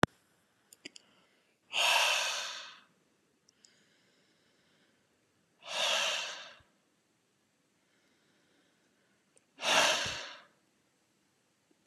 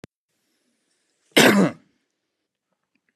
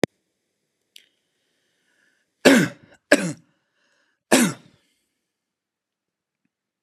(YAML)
exhalation_length: 11.9 s
exhalation_amplitude: 20942
exhalation_signal_mean_std_ratio: 0.33
cough_length: 3.2 s
cough_amplitude: 30864
cough_signal_mean_std_ratio: 0.27
three_cough_length: 6.8 s
three_cough_amplitude: 32211
three_cough_signal_mean_std_ratio: 0.22
survey_phase: beta (2021-08-13 to 2022-03-07)
age: 18-44
gender: Male
wearing_mask: 'No'
symptom_none: true
smoker_status: Ex-smoker
respiratory_condition_asthma: false
respiratory_condition_other: false
recruitment_source: REACT
submission_delay: 2 days
covid_test_result: Negative
covid_test_method: RT-qPCR